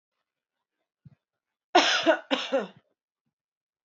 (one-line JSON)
{"cough_length": "3.8 s", "cough_amplitude": 19368, "cough_signal_mean_std_ratio": 0.31, "survey_phase": "beta (2021-08-13 to 2022-03-07)", "age": "18-44", "gender": "Female", "wearing_mask": "No", "symptom_none": true, "smoker_status": "Ex-smoker", "respiratory_condition_asthma": false, "respiratory_condition_other": false, "recruitment_source": "REACT", "submission_delay": "4 days", "covid_test_result": "Negative", "covid_test_method": "RT-qPCR", "influenza_a_test_result": "Negative", "influenza_b_test_result": "Negative"}